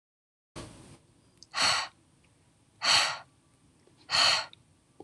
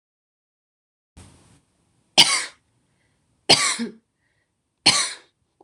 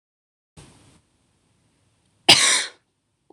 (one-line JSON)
{"exhalation_length": "5.0 s", "exhalation_amplitude": 10096, "exhalation_signal_mean_std_ratio": 0.37, "three_cough_length": "5.6 s", "three_cough_amplitude": 26963, "three_cough_signal_mean_std_ratio": 0.27, "cough_length": "3.3 s", "cough_amplitude": 27255, "cough_signal_mean_std_ratio": 0.24, "survey_phase": "alpha (2021-03-01 to 2021-08-12)", "age": "18-44", "gender": "Female", "wearing_mask": "No", "symptom_none": true, "smoker_status": "Never smoked", "respiratory_condition_asthma": false, "respiratory_condition_other": false, "recruitment_source": "REACT", "submission_delay": "1 day", "covid_test_result": "Negative", "covid_test_method": "RT-qPCR"}